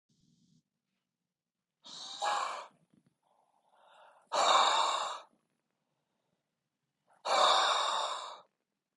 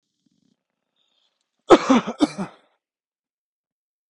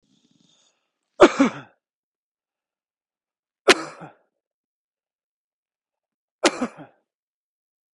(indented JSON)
{
  "exhalation_length": "9.0 s",
  "exhalation_amplitude": 6840,
  "exhalation_signal_mean_std_ratio": 0.41,
  "cough_length": "4.1 s",
  "cough_amplitude": 28188,
  "cough_signal_mean_std_ratio": 0.22,
  "three_cough_length": "7.9 s",
  "three_cough_amplitude": 32406,
  "three_cough_signal_mean_std_ratio": 0.18,
  "survey_phase": "beta (2021-08-13 to 2022-03-07)",
  "age": "18-44",
  "gender": "Male",
  "wearing_mask": "No",
  "symptom_fatigue": true,
  "symptom_headache": true,
  "symptom_other": true,
  "smoker_status": "Current smoker (e-cigarettes or vapes only)",
  "respiratory_condition_asthma": false,
  "respiratory_condition_other": false,
  "recruitment_source": "Test and Trace",
  "submission_delay": "2 days",
  "covid_test_result": "Positive",
  "covid_test_method": "LFT"
}